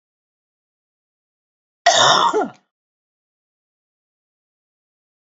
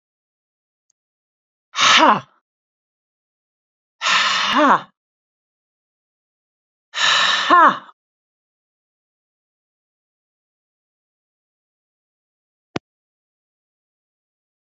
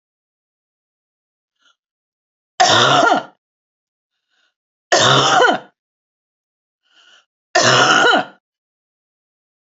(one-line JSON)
{"cough_length": "5.2 s", "cough_amplitude": 28313, "cough_signal_mean_std_ratio": 0.26, "exhalation_length": "14.8 s", "exhalation_amplitude": 31225, "exhalation_signal_mean_std_ratio": 0.28, "three_cough_length": "9.7 s", "three_cough_amplitude": 32658, "three_cough_signal_mean_std_ratio": 0.38, "survey_phase": "beta (2021-08-13 to 2022-03-07)", "age": "65+", "gender": "Female", "wearing_mask": "No", "symptom_none": true, "smoker_status": "Ex-smoker", "respiratory_condition_asthma": false, "respiratory_condition_other": false, "recruitment_source": "REACT", "submission_delay": "1 day", "covid_test_result": "Negative", "covid_test_method": "RT-qPCR", "influenza_a_test_result": "Negative", "influenza_b_test_result": "Negative"}